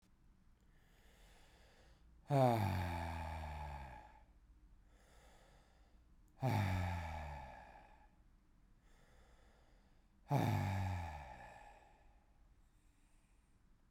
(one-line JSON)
{"exhalation_length": "13.9 s", "exhalation_amplitude": 2758, "exhalation_signal_mean_std_ratio": 0.44, "survey_phase": "beta (2021-08-13 to 2022-03-07)", "age": "45-64", "gender": "Male", "wearing_mask": "No", "symptom_cough_any": true, "symptom_runny_or_blocked_nose": true, "symptom_abdominal_pain": true, "symptom_fatigue": true, "symptom_headache": true, "smoker_status": "Never smoked", "respiratory_condition_asthma": false, "respiratory_condition_other": false, "recruitment_source": "Test and Trace", "submission_delay": "1 day", "covid_test_result": "Positive", "covid_test_method": "LFT"}